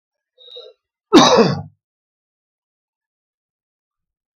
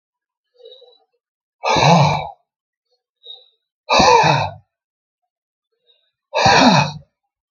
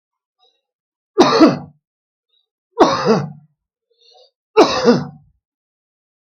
{"cough_length": "4.4 s", "cough_amplitude": 32768, "cough_signal_mean_std_ratio": 0.25, "exhalation_length": "7.5 s", "exhalation_amplitude": 32768, "exhalation_signal_mean_std_ratio": 0.4, "three_cough_length": "6.2 s", "three_cough_amplitude": 32768, "three_cough_signal_mean_std_ratio": 0.35, "survey_phase": "beta (2021-08-13 to 2022-03-07)", "age": "65+", "gender": "Male", "wearing_mask": "No", "symptom_shortness_of_breath": true, "symptom_onset": "12 days", "smoker_status": "Ex-smoker", "respiratory_condition_asthma": false, "respiratory_condition_other": false, "recruitment_source": "REACT", "submission_delay": "4 days", "covid_test_result": "Negative", "covid_test_method": "RT-qPCR", "influenza_a_test_result": "Negative", "influenza_b_test_result": "Negative"}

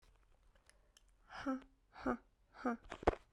{"exhalation_length": "3.3 s", "exhalation_amplitude": 5158, "exhalation_signal_mean_std_ratio": 0.32, "survey_phase": "beta (2021-08-13 to 2022-03-07)", "age": "18-44", "gender": "Female", "wearing_mask": "No", "symptom_diarrhoea": true, "symptom_fatigue": true, "symptom_onset": "12 days", "smoker_status": "Never smoked", "respiratory_condition_asthma": false, "respiratory_condition_other": false, "recruitment_source": "REACT", "submission_delay": "1 day", "covid_test_result": "Negative", "covid_test_method": "RT-qPCR"}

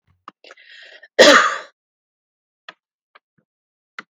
{"cough_length": "4.1 s", "cough_amplitude": 32768, "cough_signal_mean_std_ratio": 0.24, "survey_phase": "beta (2021-08-13 to 2022-03-07)", "age": "65+", "gender": "Female", "wearing_mask": "No", "symptom_none": true, "smoker_status": "Never smoked", "respiratory_condition_asthma": false, "respiratory_condition_other": false, "recruitment_source": "REACT", "submission_delay": "2 days", "covid_test_result": "Negative", "covid_test_method": "RT-qPCR", "influenza_a_test_result": "Negative", "influenza_b_test_result": "Negative"}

